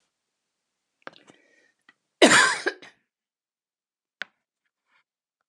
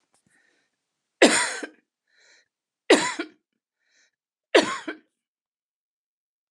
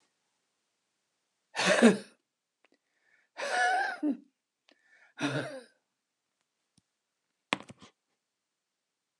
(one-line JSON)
{"cough_length": "5.5 s", "cough_amplitude": 27441, "cough_signal_mean_std_ratio": 0.21, "three_cough_length": "6.5 s", "three_cough_amplitude": 27252, "three_cough_signal_mean_std_ratio": 0.25, "exhalation_length": "9.2 s", "exhalation_amplitude": 13268, "exhalation_signal_mean_std_ratio": 0.28, "survey_phase": "alpha (2021-03-01 to 2021-08-12)", "age": "65+", "gender": "Female", "wearing_mask": "No", "symptom_none": true, "smoker_status": "Ex-smoker", "respiratory_condition_asthma": false, "respiratory_condition_other": false, "recruitment_source": "REACT", "submission_delay": "2 days", "covid_test_result": "Negative", "covid_test_method": "RT-qPCR"}